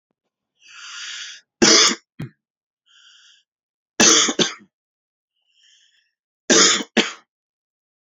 {"three_cough_length": "8.1 s", "three_cough_amplitude": 31284, "three_cough_signal_mean_std_ratio": 0.32, "survey_phase": "beta (2021-08-13 to 2022-03-07)", "age": "18-44", "gender": "Male", "wearing_mask": "No", "symptom_runny_or_blocked_nose": true, "symptom_onset": "13 days", "smoker_status": "Never smoked", "respiratory_condition_asthma": true, "respiratory_condition_other": false, "recruitment_source": "REACT", "submission_delay": "6 days", "covid_test_result": "Negative", "covid_test_method": "RT-qPCR", "influenza_a_test_result": "Negative", "influenza_b_test_result": "Negative"}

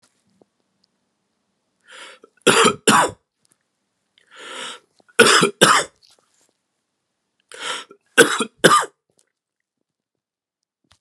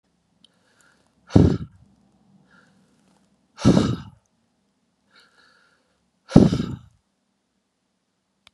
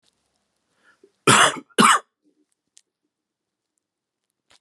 {"three_cough_length": "11.0 s", "three_cough_amplitude": 32768, "three_cough_signal_mean_std_ratio": 0.29, "exhalation_length": "8.5 s", "exhalation_amplitude": 32768, "exhalation_signal_mean_std_ratio": 0.23, "cough_length": "4.6 s", "cough_amplitude": 27480, "cough_signal_mean_std_ratio": 0.25, "survey_phase": "beta (2021-08-13 to 2022-03-07)", "age": "18-44", "gender": "Male", "wearing_mask": "No", "symptom_cough_any": true, "symptom_runny_or_blocked_nose": true, "symptom_fatigue": true, "symptom_headache": true, "symptom_onset": "4 days", "smoker_status": "Never smoked", "respiratory_condition_asthma": false, "respiratory_condition_other": false, "recruitment_source": "Test and Trace", "submission_delay": "2 days", "covid_test_result": "Positive", "covid_test_method": "LAMP"}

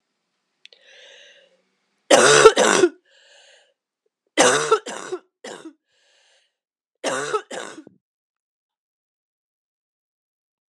{"three_cough_length": "10.7 s", "three_cough_amplitude": 32768, "three_cough_signal_mean_std_ratio": 0.29, "survey_phase": "alpha (2021-03-01 to 2021-08-12)", "age": "45-64", "gender": "Female", "wearing_mask": "No", "symptom_cough_any": true, "symptom_new_continuous_cough": true, "symptom_fatigue": true, "symptom_headache": true, "symptom_change_to_sense_of_smell_or_taste": true, "smoker_status": "Ex-smoker", "respiratory_condition_asthma": false, "respiratory_condition_other": false, "recruitment_source": "Test and Trace", "submission_delay": "2 days", "covid_test_result": "Positive", "covid_test_method": "LFT"}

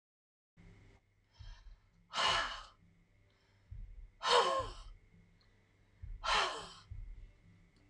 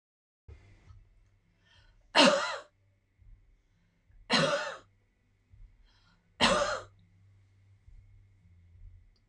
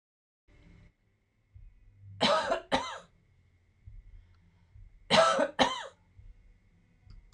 {"exhalation_length": "7.9 s", "exhalation_amplitude": 5589, "exhalation_signal_mean_std_ratio": 0.39, "three_cough_length": "9.3 s", "three_cough_amplitude": 12136, "three_cough_signal_mean_std_ratio": 0.29, "cough_length": "7.3 s", "cough_amplitude": 11201, "cough_signal_mean_std_ratio": 0.34, "survey_phase": "beta (2021-08-13 to 2022-03-07)", "age": "65+", "gender": "Female", "wearing_mask": "No", "symptom_none": true, "smoker_status": "Ex-smoker", "respiratory_condition_asthma": false, "respiratory_condition_other": false, "recruitment_source": "REACT", "submission_delay": "2 days", "covid_test_result": "Negative", "covid_test_method": "RT-qPCR", "influenza_a_test_result": "Negative", "influenza_b_test_result": "Negative"}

